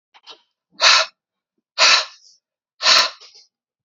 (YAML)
exhalation_length: 3.8 s
exhalation_amplitude: 31134
exhalation_signal_mean_std_ratio: 0.36
survey_phase: alpha (2021-03-01 to 2021-08-12)
age: 45-64
gender: Male
wearing_mask: 'No'
symptom_none: true
smoker_status: Ex-smoker
respiratory_condition_asthma: false
respiratory_condition_other: false
recruitment_source: REACT
submission_delay: 2 days
covid_test_result: Negative
covid_test_method: RT-qPCR